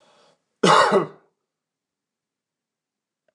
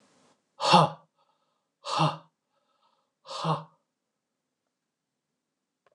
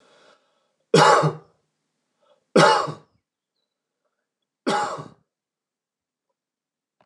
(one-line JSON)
{"cough_length": "3.3 s", "cough_amplitude": 25601, "cough_signal_mean_std_ratio": 0.28, "exhalation_length": "5.9 s", "exhalation_amplitude": 16977, "exhalation_signal_mean_std_ratio": 0.26, "three_cough_length": "7.1 s", "three_cough_amplitude": 28340, "three_cough_signal_mean_std_ratio": 0.29, "survey_phase": "beta (2021-08-13 to 2022-03-07)", "age": "45-64", "gender": "Male", "wearing_mask": "No", "symptom_none": true, "symptom_onset": "9 days", "smoker_status": "Never smoked", "respiratory_condition_asthma": false, "respiratory_condition_other": false, "recruitment_source": "REACT", "submission_delay": "2 days", "covid_test_result": "Negative", "covid_test_method": "RT-qPCR"}